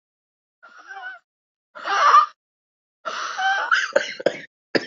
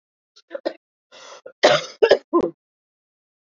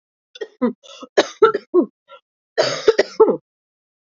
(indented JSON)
{
  "exhalation_length": "4.9 s",
  "exhalation_amplitude": 24131,
  "exhalation_signal_mean_std_ratio": 0.41,
  "cough_length": "3.5 s",
  "cough_amplitude": 32743,
  "cough_signal_mean_std_ratio": 0.3,
  "three_cough_length": "4.2 s",
  "three_cough_amplitude": 28336,
  "three_cough_signal_mean_std_ratio": 0.36,
  "survey_phase": "beta (2021-08-13 to 2022-03-07)",
  "age": "18-44",
  "gender": "Female",
  "wearing_mask": "No",
  "symptom_cough_any": true,
  "symptom_new_continuous_cough": true,
  "symptom_runny_or_blocked_nose": true,
  "symptom_shortness_of_breath": true,
  "symptom_fatigue": true,
  "symptom_headache": true,
  "symptom_change_to_sense_of_smell_or_taste": true,
  "symptom_loss_of_taste": true,
  "smoker_status": "Ex-smoker",
  "respiratory_condition_asthma": false,
  "respiratory_condition_other": false,
  "recruitment_source": "Test and Trace",
  "submission_delay": "2 days",
  "covid_test_result": "Positive",
  "covid_test_method": "RT-qPCR",
  "covid_ct_value": 15.7,
  "covid_ct_gene": "N gene"
}